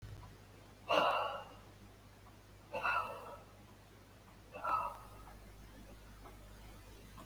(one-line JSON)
{"exhalation_length": "7.3 s", "exhalation_amplitude": 4777, "exhalation_signal_mean_std_ratio": 0.49, "survey_phase": "beta (2021-08-13 to 2022-03-07)", "age": "65+", "gender": "Male", "wearing_mask": "No", "symptom_none": true, "smoker_status": "Ex-smoker", "respiratory_condition_asthma": false, "respiratory_condition_other": true, "recruitment_source": "REACT", "submission_delay": "20 days", "covid_test_result": "Negative", "covid_test_method": "RT-qPCR", "influenza_a_test_result": "Unknown/Void", "influenza_b_test_result": "Unknown/Void"}